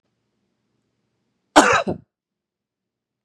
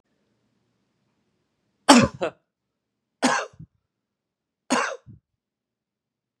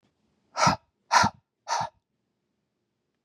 {
  "cough_length": "3.2 s",
  "cough_amplitude": 32768,
  "cough_signal_mean_std_ratio": 0.23,
  "three_cough_length": "6.4 s",
  "three_cough_amplitude": 32767,
  "three_cough_signal_mean_std_ratio": 0.22,
  "exhalation_length": "3.2 s",
  "exhalation_amplitude": 18897,
  "exhalation_signal_mean_std_ratio": 0.31,
  "survey_phase": "beta (2021-08-13 to 2022-03-07)",
  "age": "18-44",
  "gender": "Male",
  "wearing_mask": "No",
  "symptom_none": true,
  "smoker_status": "Ex-smoker",
  "respiratory_condition_asthma": false,
  "respiratory_condition_other": false,
  "recruitment_source": "REACT",
  "submission_delay": "1 day",
  "covid_test_result": "Negative",
  "covid_test_method": "RT-qPCR",
  "covid_ct_value": 40.0,
  "covid_ct_gene": "N gene"
}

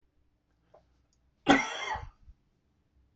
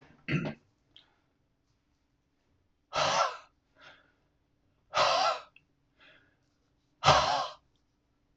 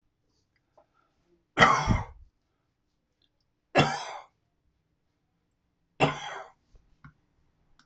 {
  "cough_length": "3.2 s",
  "cough_amplitude": 15237,
  "cough_signal_mean_std_ratio": 0.26,
  "exhalation_length": "8.4 s",
  "exhalation_amplitude": 14038,
  "exhalation_signal_mean_std_ratio": 0.34,
  "three_cough_length": "7.9 s",
  "three_cough_amplitude": 23347,
  "three_cough_signal_mean_std_ratio": 0.26,
  "survey_phase": "beta (2021-08-13 to 2022-03-07)",
  "age": "65+",
  "gender": "Male",
  "wearing_mask": "No",
  "symptom_none": true,
  "smoker_status": "Ex-smoker",
  "respiratory_condition_asthma": true,
  "respiratory_condition_other": false,
  "recruitment_source": "REACT",
  "submission_delay": "1 day",
  "covid_test_result": "Negative",
  "covid_test_method": "RT-qPCR",
  "influenza_a_test_result": "Negative",
  "influenza_b_test_result": "Negative"
}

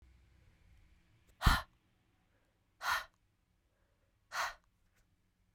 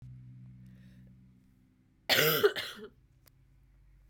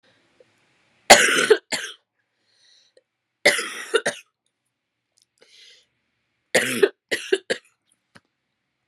{
  "exhalation_length": "5.5 s",
  "exhalation_amplitude": 7935,
  "exhalation_signal_mean_std_ratio": 0.23,
  "cough_length": "4.1 s",
  "cough_amplitude": 9507,
  "cough_signal_mean_std_ratio": 0.33,
  "three_cough_length": "8.9 s",
  "three_cough_amplitude": 32768,
  "three_cough_signal_mean_std_ratio": 0.27,
  "survey_phase": "beta (2021-08-13 to 2022-03-07)",
  "age": "18-44",
  "gender": "Female",
  "wearing_mask": "No",
  "symptom_cough_any": true,
  "symptom_runny_or_blocked_nose": true,
  "symptom_fatigue": true,
  "symptom_onset": "2 days",
  "smoker_status": "Never smoked",
  "respiratory_condition_asthma": false,
  "respiratory_condition_other": false,
  "recruitment_source": "Test and Trace",
  "submission_delay": "1 day",
  "covid_test_result": "Positive",
  "covid_test_method": "RT-qPCR",
  "covid_ct_value": 18.8,
  "covid_ct_gene": "N gene",
  "covid_ct_mean": 18.8,
  "covid_viral_load": "670000 copies/ml",
  "covid_viral_load_category": "Low viral load (10K-1M copies/ml)"
}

